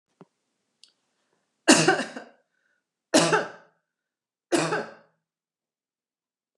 {"three_cough_length": "6.6 s", "three_cough_amplitude": 29321, "three_cough_signal_mean_std_ratio": 0.29, "survey_phase": "beta (2021-08-13 to 2022-03-07)", "age": "65+", "gender": "Female", "wearing_mask": "No", "symptom_abdominal_pain": true, "symptom_other": true, "smoker_status": "Never smoked", "respiratory_condition_asthma": false, "respiratory_condition_other": false, "recruitment_source": "Test and Trace", "submission_delay": "1 day", "covid_test_result": "Negative", "covid_test_method": "RT-qPCR"}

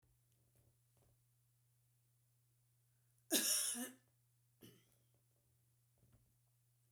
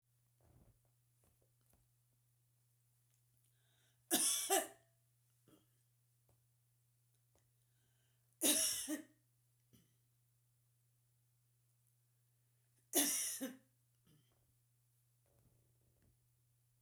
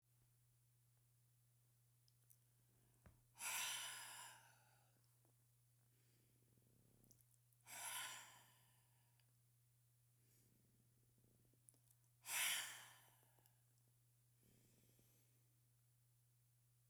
{"cough_length": "6.9 s", "cough_amplitude": 3375, "cough_signal_mean_std_ratio": 0.25, "three_cough_length": "16.8 s", "three_cough_amplitude": 3425, "three_cough_signal_mean_std_ratio": 0.26, "exhalation_length": "16.9 s", "exhalation_amplitude": 890, "exhalation_signal_mean_std_ratio": 0.34, "survey_phase": "beta (2021-08-13 to 2022-03-07)", "age": "65+", "gender": "Female", "wearing_mask": "No", "symptom_none": true, "smoker_status": "Ex-smoker", "respiratory_condition_asthma": false, "respiratory_condition_other": false, "recruitment_source": "REACT", "submission_delay": "2 days", "covid_test_result": "Negative", "covid_test_method": "RT-qPCR"}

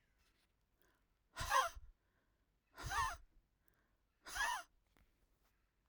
{"exhalation_length": "5.9 s", "exhalation_amplitude": 2717, "exhalation_signal_mean_std_ratio": 0.33, "survey_phase": "alpha (2021-03-01 to 2021-08-12)", "age": "18-44", "gender": "Female", "wearing_mask": "No", "symptom_none": true, "smoker_status": "Ex-smoker", "respiratory_condition_asthma": false, "respiratory_condition_other": false, "recruitment_source": "REACT", "submission_delay": "1 day", "covid_test_result": "Negative", "covid_test_method": "RT-qPCR"}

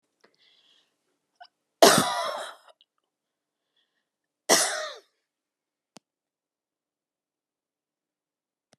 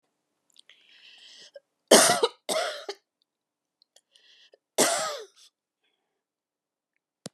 {"cough_length": "8.8 s", "cough_amplitude": 31738, "cough_signal_mean_std_ratio": 0.21, "three_cough_length": "7.3 s", "three_cough_amplitude": 27036, "three_cough_signal_mean_std_ratio": 0.26, "survey_phase": "beta (2021-08-13 to 2022-03-07)", "age": "65+", "gender": "Female", "wearing_mask": "No", "symptom_none": true, "smoker_status": "Ex-smoker", "respiratory_condition_asthma": false, "respiratory_condition_other": false, "recruitment_source": "REACT", "submission_delay": "12 days", "covid_test_result": "Negative", "covid_test_method": "RT-qPCR"}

